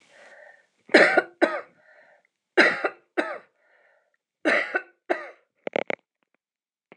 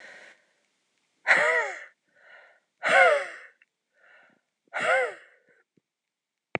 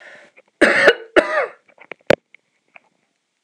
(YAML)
three_cough_length: 7.0 s
three_cough_amplitude: 25254
three_cough_signal_mean_std_ratio: 0.31
exhalation_length: 6.6 s
exhalation_amplitude: 18496
exhalation_signal_mean_std_ratio: 0.35
cough_length: 3.4 s
cough_amplitude: 26028
cough_signal_mean_std_ratio: 0.33
survey_phase: beta (2021-08-13 to 2022-03-07)
age: 65+
gender: Female
wearing_mask: 'No'
symptom_none: true
symptom_onset: 5 days
smoker_status: Never smoked
respiratory_condition_asthma: true
respiratory_condition_other: false
recruitment_source: REACT
submission_delay: 3 days
covid_test_result: Negative
covid_test_method: RT-qPCR
influenza_a_test_result: Negative
influenza_b_test_result: Negative